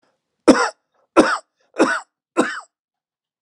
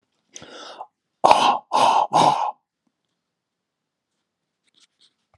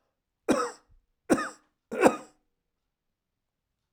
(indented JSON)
{
  "cough_length": "3.4 s",
  "cough_amplitude": 32768,
  "cough_signal_mean_std_ratio": 0.33,
  "exhalation_length": "5.4 s",
  "exhalation_amplitude": 32768,
  "exhalation_signal_mean_std_ratio": 0.35,
  "three_cough_length": "3.9 s",
  "three_cough_amplitude": 20599,
  "three_cough_signal_mean_std_ratio": 0.27,
  "survey_phase": "alpha (2021-03-01 to 2021-08-12)",
  "age": "65+",
  "gender": "Male",
  "wearing_mask": "No",
  "symptom_none": true,
  "smoker_status": "Never smoked",
  "respiratory_condition_asthma": false,
  "respiratory_condition_other": false,
  "recruitment_source": "REACT",
  "submission_delay": "2 days",
  "covid_test_result": "Negative",
  "covid_test_method": "RT-qPCR"
}